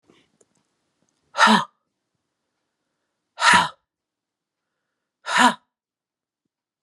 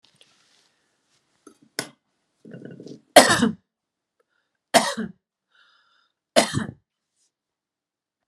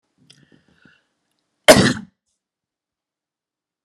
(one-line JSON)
{"exhalation_length": "6.8 s", "exhalation_amplitude": 29019, "exhalation_signal_mean_std_ratio": 0.26, "three_cough_length": "8.3 s", "three_cough_amplitude": 32768, "three_cough_signal_mean_std_ratio": 0.22, "cough_length": "3.8 s", "cough_amplitude": 32768, "cough_signal_mean_std_ratio": 0.19, "survey_phase": "beta (2021-08-13 to 2022-03-07)", "age": "45-64", "gender": "Female", "wearing_mask": "No", "symptom_none": true, "smoker_status": "Ex-smoker", "respiratory_condition_asthma": false, "respiratory_condition_other": false, "recruitment_source": "REACT", "submission_delay": "6 days", "covid_test_result": "Negative", "covid_test_method": "RT-qPCR", "influenza_a_test_result": "Negative", "influenza_b_test_result": "Negative"}